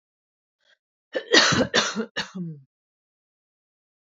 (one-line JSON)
{"cough_length": "4.2 s", "cough_amplitude": 24747, "cough_signal_mean_std_ratio": 0.34, "survey_phase": "beta (2021-08-13 to 2022-03-07)", "age": "18-44", "gender": "Female", "wearing_mask": "No", "symptom_none": true, "symptom_onset": "8 days", "smoker_status": "Never smoked", "respiratory_condition_asthma": false, "respiratory_condition_other": false, "recruitment_source": "REACT", "submission_delay": "2 days", "covid_test_result": "Negative", "covid_test_method": "RT-qPCR", "influenza_a_test_result": "Negative", "influenza_b_test_result": "Negative"}